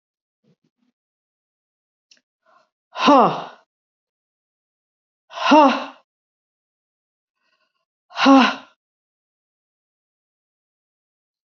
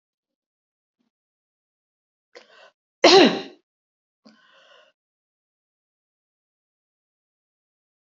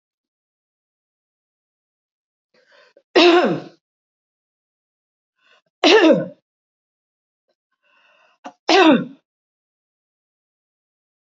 {"exhalation_length": "11.5 s", "exhalation_amplitude": 27115, "exhalation_signal_mean_std_ratio": 0.24, "cough_length": "8.0 s", "cough_amplitude": 27953, "cough_signal_mean_std_ratio": 0.16, "three_cough_length": "11.3 s", "three_cough_amplitude": 28014, "three_cough_signal_mean_std_ratio": 0.26, "survey_phase": "beta (2021-08-13 to 2022-03-07)", "age": "65+", "gender": "Female", "wearing_mask": "No", "symptom_cough_any": true, "smoker_status": "Never smoked", "respiratory_condition_asthma": false, "respiratory_condition_other": false, "recruitment_source": "REACT", "submission_delay": "1 day", "covid_test_result": "Negative", "covid_test_method": "RT-qPCR", "influenza_a_test_result": "Negative", "influenza_b_test_result": "Negative"}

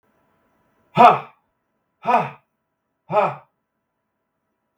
{"exhalation_length": "4.8 s", "exhalation_amplitude": 32768, "exhalation_signal_mean_std_ratio": 0.26, "survey_phase": "beta (2021-08-13 to 2022-03-07)", "age": "45-64", "gender": "Male", "wearing_mask": "No", "symptom_none": true, "smoker_status": "Never smoked", "respiratory_condition_asthma": true, "respiratory_condition_other": false, "recruitment_source": "REACT", "submission_delay": "1 day", "covid_test_result": "Negative", "covid_test_method": "RT-qPCR", "influenza_a_test_result": "Negative", "influenza_b_test_result": "Negative"}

